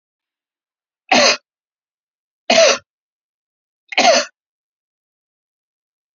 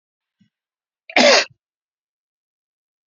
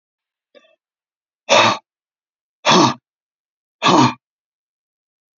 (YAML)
three_cough_length: 6.1 s
three_cough_amplitude: 32768
three_cough_signal_mean_std_ratio: 0.29
cough_length: 3.1 s
cough_amplitude: 29820
cough_signal_mean_std_ratio: 0.24
exhalation_length: 5.4 s
exhalation_amplitude: 32005
exhalation_signal_mean_std_ratio: 0.32
survey_phase: beta (2021-08-13 to 2022-03-07)
age: 45-64
gender: Male
wearing_mask: 'No'
symptom_none: true
symptom_onset: 5 days
smoker_status: Never smoked
respiratory_condition_asthma: false
respiratory_condition_other: false
recruitment_source: REACT
submission_delay: 2 days
covid_test_result: Negative
covid_test_method: RT-qPCR